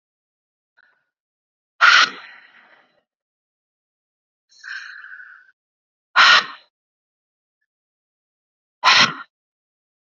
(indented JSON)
{
  "exhalation_length": "10.1 s",
  "exhalation_amplitude": 32209,
  "exhalation_signal_mean_std_ratio": 0.24,
  "survey_phase": "beta (2021-08-13 to 2022-03-07)",
  "age": "18-44",
  "gender": "Female",
  "wearing_mask": "No",
  "symptom_cough_any": true,
  "symptom_runny_or_blocked_nose": true,
  "symptom_sore_throat": true,
  "symptom_onset": "6 days",
  "smoker_status": "Prefer not to say",
  "respiratory_condition_asthma": false,
  "respiratory_condition_other": false,
  "recruitment_source": "REACT",
  "submission_delay": "1 day",
  "covid_test_result": "Negative",
  "covid_test_method": "RT-qPCR",
  "influenza_a_test_result": "Negative",
  "influenza_b_test_result": "Negative"
}